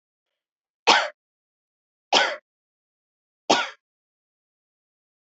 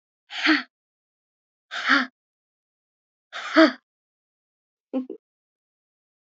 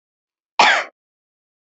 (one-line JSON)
{"three_cough_length": "5.3 s", "three_cough_amplitude": 28669, "three_cough_signal_mean_std_ratio": 0.24, "exhalation_length": "6.2 s", "exhalation_amplitude": 26217, "exhalation_signal_mean_std_ratio": 0.26, "cough_length": "1.6 s", "cough_amplitude": 28669, "cough_signal_mean_std_ratio": 0.3, "survey_phase": "beta (2021-08-13 to 2022-03-07)", "age": "18-44", "gender": "Female", "wearing_mask": "No", "symptom_fatigue": true, "symptom_onset": "13 days", "smoker_status": "Never smoked", "respiratory_condition_asthma": false, "respiratory_condition_other": false, "recruitment_source": "REACT", "submission_delay": "2 days", "covid_test_result": "Negative", "covid_test_method": "RT-qPCR"}